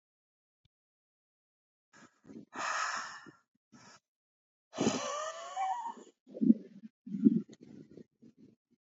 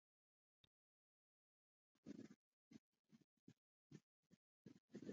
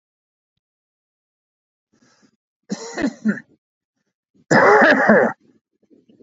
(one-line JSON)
{"exhalation_length": "8.9 s", "exhalation_amplitude": 9959, "exhalation_signal_mean_std_ratio": 0.33, "cough_length": "5.1 s", "cough_amplitude": 294, "cough_signal_mean_std_ratio": 0.27, "three_cough_length": "6.2 s", "three_cough_amplitude": 28690, "three_cough_signal_mean_std_ratio": 0.34, "survey_phase": "alpha (2021-03-01 to 2021-08-12)", "age": "45-64", "gender": "Male", "wearing_mask": "No", "symptom_shortness_of_breath": true, "symptom_diarrhoea": true, "symptom_fatigue": true, "symptom_headache": true, "smoker_status": "Never smoked", "respiratory_condition_asthma": false, "respiratory_condition_other": false, "recruitment_source": "Test and Trace", "submission_delay": "2 days", "covid_test_result": "Positive", "covid_test_method": "RT-qPCR"}